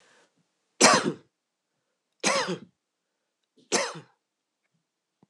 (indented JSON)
{
  "three_cough_length": "5.3 s",
  "three_cough_amplitude": 24664,
  "three_cough_signal_mean_std_ratio": 0.28,
  "survey_phase": "beta (2021-08-13 to 2022-03-07)",
  "age": "45-64",
  "gender": "Female",
  "wearing_mask": "Yes",
  "symptom_cough_any": true,
  "symptom_runny_or_blocked_nose": true,
  "symptom_headache": true,
  "symptom_change_to_sense_of_smell_or_taste": true,
  "symptom_loss_of_taste": true,
  "symptom_onset": "4 days",
  "smoker_status": "Never smoked",
  "respiratory_condition_asthma": false,
  "respiratory_condition_other": false,
  "recruitment_source": "Test and Trace",
  "submission_delay": "1 day",
  "covid_test_result": "Positive",
  "covid_test_method": "RT-qPCR",
  "covid_ct_value": 21.4,
  "covid_ct_gene": "N gene"
}